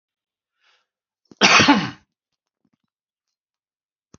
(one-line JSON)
{"cough_length": "4.2 s", "cough_amplitude": 32293, "cough_signal_mean_std_ratio": 0.25, "survey_phase": "beta (2021-08-13 to 2022-03-07)", "age": "45-64", "gender": "Male", "wearing_mask": "No", "symptom_runny_or_blocked_nose": true, "symptom_sore_throat": true, "symptom_fatigue": true, "symptom_headache": true, "smoker_status": "Never smoked", "respiratory_condition_asthma": false, "respiratory_condition_other": false, "recruitment_source": "Test and Trace", "submission_delay": "2 days", "covid_test_result": "Positive", "covid_test_method": "LFT"}